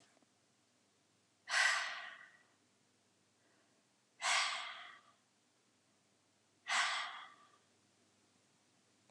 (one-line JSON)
{"exhalation_length": "9.1 s", "exhalation_amplitude": 3120, "exhalation_signal_mean_std_ratio": 0.34, "survey_phase": "beta (2021-08-13 to 2022-03-07)", "age": "45-64", "gender": "Female", "wearing_mask": "No", "symptom_none": true, "smoker_status": "Never smoked", "respiratory_condition_asthma": false, "respiratory_condition_other": false, "recruitment_source": "REACT", "submission_delay": "2 days", "covid_test_result": "Negative", "covid_test_method": "RT-qPCR", "influenza_a_test_result": "Negative", "influenza_b_test_result": "Negative"}